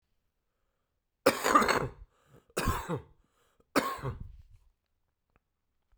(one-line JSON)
{"three_cough_length": "6.0 s", "three_cough_amplitude": 12791, "three_cough_signal_mean_std_ratio": 0.34, "survey_phase": "beta (2021-08-13 to 2022-03-07)", "age": "45-64", "gender": "Male", "wearing_mask": "No", "symptom_cough_any": true, "symptom_runny_or_blocked_nose": true, "symptom_fatigue": true, "symptom_fever_high_temperature": true, "symptom_change_to_sense_of_smell_or_taste": true, "symptom_loss_of_taste": true, "symptom_onset": "5 days", "smoker_status": "Never smoked", "respiratory_condition_asthma": false, "respiratory_condition_other": false, "recruitment_source": "Test and Trace", "submission_delay": "2 days", "covid_test_result": "Positive", "covid_test_method": "RT-qPCR"}